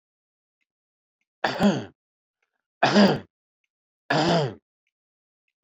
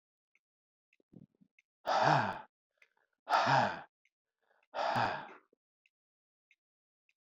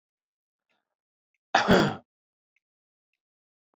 three_cough_length: 5.6 s
three_cough_amplitude: 17626
three_cough_signal_mean_std_ratio: 0.35
exhalation_length: 7.3 s
exhalation_amplitude: 6198
exhalation_signal_mean_std_ratio: 0.35
cough_length: 3.8 s
cough_amplitude: 15340
cough_signal_mean_std_ratio: 0.24
survey_phase: beta (2021-08-13 to 2022-03-07)
age: 45-64
gender: Male
wearing_mask: 'No'
symptom_none: true
smoker_status: Never smoked
respiratory_condition_asthma: false
respiratory_condition_other: false
recruitment_source: REACT
submission_delay: 1 day
covid_test_result: Negative
covid_test_method: RT-qPCR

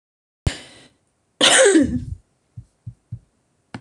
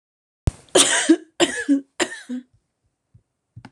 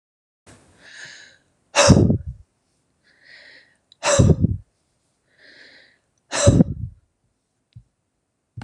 cough_length: 3.8 s
cough_amplitude: 25923
cough_signal_mean_std_ratio: 0.36
three_cough_length: 3.7 s
three_cough_amplitude: 26028
three_cough_signal_mean_std_ratio: 0.38
exhalation_length: 8.6 s
exhalation_amplitude: 26028
exhalation_signal_mean_std_ratio: 0.31
survey_phase: beta (2021-08-13 to 2022-03-07)
age: 65+
gender: Female
wearing_mask: 'No'
symptom_none: true
smoker_status: Ex-smoker
respiratory_condition_asthma: false
respiratory_condition_other: false
recruitment_source: REACT
submission_delay: 1 day
covid_test_result: Negative
covid_test_method: RT-qPCR
influenza_a_test_result: Negative
influenza_b_test_result: Negative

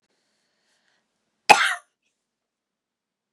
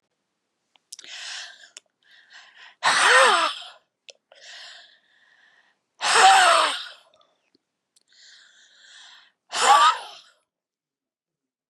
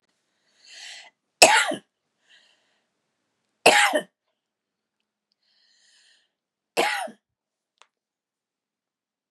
cough_length: 3.3 s
cough_amplitude: 32768
cough_signal_mean_std_ratio: 0.17
exhalation_length: 11.7 s
exhalation_amplitude: 23477
exhalation_signal_mean_std_ratio: 0.34
three_cough_length: 9.3 s
three_cough_amplitude: 32768
three_cough_signal_mean_std_ratio: 0.23
survey_phase: beta (2021-08-13 to 2022-03-07)
age: 65+
gender: Female
wearing_mask: 'No'
symptom_cough_any: true
symptom_runny_or_blocked_nose: true
symptom_shortness_of_breath: true
symptom_sore_throat: true
symptom_abdominal_pain: true
symptom_diarrhoea: true
symptom_fatigue: true
symptom_headache: true
symptom_change_to_sense_of_smell_or_taste: true
symptom_loss_of_taste: true
smoker_status: Ex-smoker
respiratory_condition_asthma: true
respiratory_condition_other: false
recruitment_source: Test and Trace
submission_delay: 2 days
covid_test_result: Positive
covid_test_method: RT-qPCR
covid_ct_value: 28.0
covid_ct_gene: ORF1ab gene
covid_ct_mean: 28.2
covid_viral_load: 560 copies/ml
covid_viral_load_category: Minimal viral load (< 10K copies/ml)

